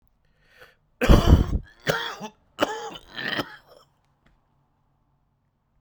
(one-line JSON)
{"three_cough_length": "5.8 s", "three_cough_amplitude": 25855, "three_cough_signal_mean_std_ratio": 0.31, "survey_phase": "beta (2021-08-13 to 2022-03-07)", "age": "18-44", "gender": "Male", "wearing_mask": "No", "symptom_cough_any": true, "symptom_new_continuous_cough": true, "symptom_runny_or_blocked_nose": true, "symptom_shortness_of_breath": true, "symptom_sore_throat": true, "symptom_abdominal_pain": true, "symptom_diarrhoea": true, "symptom_fatigue": true, "symptom_fever_high_temperature": true, "symptom_headache": true, "symptom_change_to_sense_of_smell_or_taste": true, "symptom_loss_of_taste": true, "symptom_onset": "2 days", "smoker_status": "Current smoker (1 to 10 cigarettes per day)", "respiratory_condition_asthma": false, "respiratory_condition_other": false, "recruitment_source": "Test and Trace", "submission_delay": "1 day", "covid_test_result": "Positive", "covid_test_method": "RT-qPCR", "covid_ct_value": 14.9, "covid_ct_gene": "ORF1ab gene", "covid_ct_mean": 15.2, "covid_viral_load": "10000000 copies/ml", "covid_viral_load_category": "High viral load (>1M copies/ml)"}